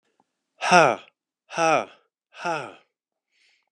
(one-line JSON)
{"exhalation_length": "3.7 s", "exhalation_amplitude": 29100, "exhalation_signal_mean_std_ratio": 0.31, "survey_phase": "beta (2021-08-13 to 2022-03-07)", "age": "45-64", "gender": "Male", "wearing_mask": "No", "symptom_cough_any": true, "symptom_runny_or_blocked_nose": true, "symptom_fever_high_temperature": true, "symptom_headache": true, "smoker_status": "Ex-smoker", "respiratory_condition_asthma": false, "respiratory_condition_other": false, "recruitment_source": "Test and Trace", "submission_delay": "2 days", "covid_test_result": "Positive", "covid_test_method": "LFT"}